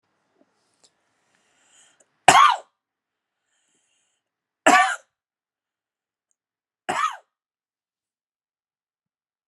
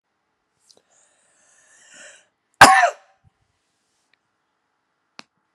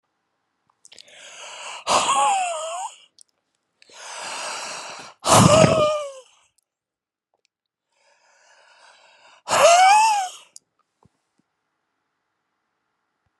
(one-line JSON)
{"three_cough_length": "9.5 s", "three_cough_amplitude": 32768, "three_cough_signal_mean_std_ratio": 0.2, "cough_length": "5.5 s", "cough_amplitude": 32768, "cough_signal_mean_std_ratio": 0.17, "exhalation_length": "13.4 s", "exhalation_amplitude": 31135, "exhalation_signal_mean_std_ratio": 0.38, "survey_phase": "beta (2021-08-13 to 2022-03-07)", "age": "45-64", "gender": "Male", "wearing_mask": "No", "symptom_cough_any": true, "symptom_new_continuous_cough": true, "symptom_shortness_of_breath": true, "symptom_diarrhoea": true, "symptom_fatigue": true, "symptom_fever_high_temperature": true, "symptom_headache": true, "symptom_change_to_sense_of_smell_or_taste": true, "symptom_onset": "3 days", "smoker_status": "Never smoked", "respiratory_condition_asthma": true, "respiratory_condition_other": false, "recruitment_source": "Test and Trace", "submission_delay": "1 day", "covid_test_result": "Positive", "covid_test_method": "ePCR"}